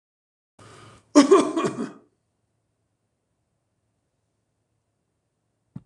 {
  "cough_length": "5.9 s",
  "cough_amplitude": 25763,
  "cough_signal_mean_std_ratio": 0.22,
  "survey_phase": "beta (2021-08-13 to 2022-03-07)",
  "age": "65+",
  "gender": "Male",
  "wearing_mask": "No",
  "symptom_change_to_sense_of_smell_or_taste": true,
  "smoker_status": "Ex-smoker",
  "respiratory_condition_asthma": true,
  "respiratory_condition_other": true,
  "recruitment_source": "REACT",
  "submission_delay": "3 days",
  "covid_test_result": "Negative",
  "covid_test_method": "RT-qPCR"
}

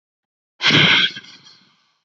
{
  "exhalation_length": "2.0 s",
  "exhalation_amplitude": 30915,
  "exhalation_signal_mean_std_ratio": 0.42,
  "survey_phase": "beta (2021-08-13 to 2022-03-07)",
  "age": "18-44",
  "gender": "Female",
  "wearing_mask": "No",
  "symptom_runny_or_blocked_nose": true,
  "symptom_abdominal_pain": true,
  "symptom_diarrhoea": true,
  "symptom_fatigue": true,
  "symptom_headache": true,
  "smoker_status": "Never smoked",
  "respiratory_condition_asthma": false,
  "respiratory_condition_other": false,
  "recruitment_source": "REACT",
  "submission_delay": "0 days",
  "covid_test_result": "Negative",
  "covid_test_method": "RT-qPCR",
  "influenza_a_test_result": "Negative",
  "influenza_b_test_result": "Negative"
}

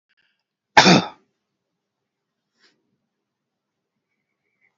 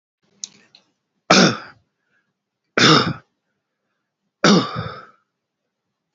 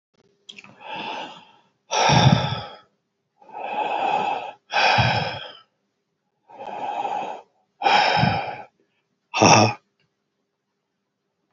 {
  "cough_length": "4.8 s",
  "cough_amplitude": 32767,
  "cough_signal_mean_std_ratio": 0.18,
  "three_cough_length": "6.1 s",
  "three_cough_amplitude": 32768,
  "three_cough_signal_mean_std_ratio": 0.31,
  "exhalation_length": "11.5 s",
  "exhalation_amplitude": 30081,
  "exhalation_signal_mean_std_ratio": 0.46,
  "survey_phase": "beta (2021-08-13 to 2022-03-07)",
  "age": "45-64",
  "gender": "Male",
  "wearing_mask": "No",
  "symptom_none": true,
  "smoker_status": "Ex-smoker",
  "respiratory_condition_asthma": false,
  "respiratory_condition_other": false,
  "recruitment_source": "REACT",
  "submission_delay": "8 days",
  "covid_test_result": "Negative",
  "covid_test_method": "RT-qPCR"
}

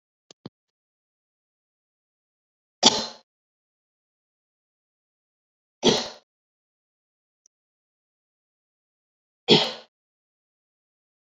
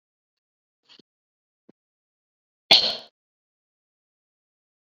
{
  "three_cough_length": "11.3 s",
  "three_cough_amplitude": 30199,
  "three_cough_signal_mean_std_ratio": 0.17,
  "cough_length": "4.9 s",
  "cough_amplitude": 27331,
  "cough_signal_mean_std_ratio": 0.15,
  "survey_phase": "beta (2021-08-13 to 2022-03-07)",
  "age": "45-64",
  "gender": "Female",
  "wearing_mask": "No",
  "symptom_none": true,
  "smoker_status": "Never smoked",
  "respiratory_condition_asthma": true,
  "respiratory_condition_other": false,
  "recruitment_source": "REACT",
  "submission_delay": "1 day",
  "covid_test_result": "Negative",
  "covid_test_method": "RT-qPCR"
}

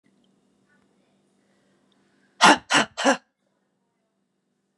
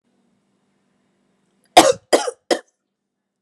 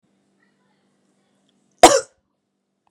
{
  "exhalation_length": "4.8 s",
  "exhalation_amplitude": 30504,
  "exhalation_signal_mean_std_ratio": 0.23,
  "three_cough_length": "3.4 s",
  "three_cough_amplitude": 32768,
  "three_cough_signal_mean_std_ratio": 0.23,
  "cough_length": "2.9 s",
  "cough_amplitude": 32768,
  "cough_signal_mean_std_ratio": 0.17,
  "survey_phase": "beta (2021-08-13 to 2022-03-07)",
  "age": "45-64",
  "gender": "Female",
  "wearing_mask": "No",
  "symptom_cough_any": true,
  "symptom_runny_or_blocked_nose": true,
  "smoker_status": "Ex-smoker",
  "respiratory_condition_asthma": false,
  "respiratory_condition_other": false,
  "recruitment_source": "Test and Trace",
  "submission_delay": "1 day",
  "covid_test_result": "Positive",
  "covid_test_method": "RT-qPCR",
  "covid_ct_value": 22.1,
  "covid_ct_gene": "N gene",
  "covid_ct_mean": 22.6,
  "covid_viral_load": "38000 copies/ml",
  "covid_viral_load_category": "Low viral load (10K-1M copies/ml)"
}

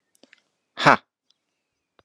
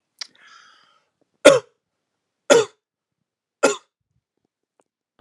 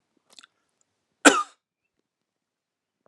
{
  "exhalation_length": "2.0 s",
  "exhalation_amplitude": 32767,
  "exhalation_signal_mean_std_ratio": 0.17,
  "three_cough_length": "5.2 s",
  "three_cough_amplitude": 32768,
  "three_cough_signal_mean_std_ratio": 0.21,
  "cough_length": "3.1 s",
  "cough_amplitude": 32768,
  "cough_signal_mean_std_ratio": 0.16,
  "survey_phase": "alpha (2021-03-01 to 2021-08-12)",
  "age": "45-64",
  "gender": "Male",
  "wearing_mask": "No",
  "symptom_none": true,
  "smoker_status": "Never smoked",
  "respiratory_condition_asthma": false,
  "respiratory_condition_other": false,
  "recruitment_source": "Test and Trace",
  "submission_delay": "1 day",
  "covid_test_result": "Positive",
  "covid_test_method": "RT-qPCR"
}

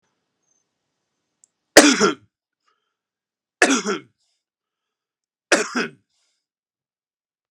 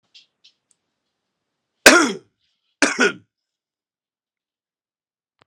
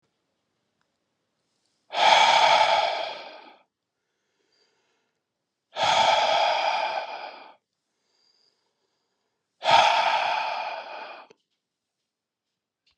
{
  "three_cough_length": "7.5 s",
  "three_cough_amplitude": 32768,
  "three_cough_signal_mean_std_ratio": 0.23,
  "cough_length": "5.5 s",
  "cough_amplitude": 32768,
  "cough_signal_mean_std_ratio": 0.21,
  "exhalation_length": "13.0 s",
  "exhalation_amplitude": 20682,
  "exhalation_signal_mean_std_ratio": 0.43,
  "survey_phase": "alpha (2021-03-01 to 2021-08-12)",
  "age": "45-64",
  "gender": "Male",
  "wearing_mask": "No",
  "symptom_none": true,
  "smoker_status": "Current smoker (e-cigarettes or vapes only)",
  "respiratory_condition_asthma": false,
  "respiratory_condition_other": false,
  "recruitment_source": "REACT",
  "submission_delay": "2 days",
  "covid_test_result": "Negative",
  "covid_test_method": "RT-qPCR"
}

